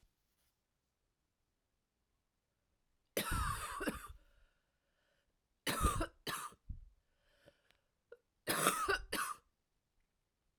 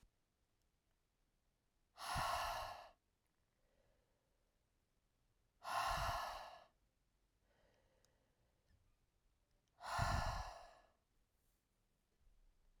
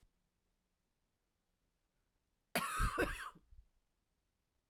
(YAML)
three_cough_length: 10.6 s
three_cough_amplitude: 6189
three_cough_signal_mean_std_ratio: 0.36
exhalation_length: 12.8 s
exhalation_amplitude: 1538
exhalation_signal_mean_std_ratio: 0.36
cough_length: 4.7 s
cough_amplitude: 2242
cough_signal_mean_std_ratio: 0.3
survey_phase: beta (2021-08-13 to 2022-03-07)
age: 45-64
gender: Female
wearing_mask: 'No'
symptom_cough_any: true
symptom_runny_or_blocked_nose: true
symptom_fatigue: true
symptom_headache: true
smoker_status: Never smoked
respiratory_condition_asthma: false
respiratory_condition_other: false
recruitment_source: Test and Trace
submission_delay: 2 days
covid_test_result: Positive
covid_test_method: RT-qPCR
covid_ct_value: 18.2
covid_ct_gene: ORF1ab gene
covid_ct_mean: 18.3
covid_viral_load: 1000000 copies/ml
covid_viral_load_category: High viral load (>1M copies/ml)